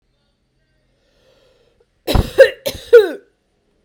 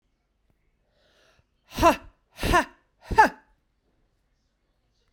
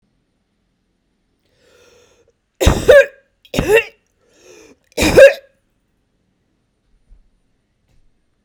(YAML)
cough_length: 3.8 s
cough_amplitude: 32768
cough_signal_mean_std_ratio: 0.27
exhalation_length: 5.1 s
exhalation_amplitude: 22494
exhalation_signal_mean_std_ratio: 0.25
three_cough_length: 8.4 s
three_cough_amplitude: 32768
three_cough_signal_mean_std_ratio: 0.26
survey_phase: beta (2021-08-13 to 2022-03-07)
age: 45-64
gender: Female
wearing_mask: 'No'
symptom_new_continuous_cough: true
symptom_runny_or_blocked_nose: true
symptom_fatigue: true
symptom_headache: true
symptom_change_to_sense_of_smell_or_taste: true
symptom_loss_of_taste: true
symptom_onset: 7 days
smoker_status: Ex-smoker
respiratory_condition_asthma: false
respiratory_condition_other: false
recruitment_source: Test and Trace
submission_delay: 2 days
covid_test_result: Positive
covid_test_method: RT-qPCR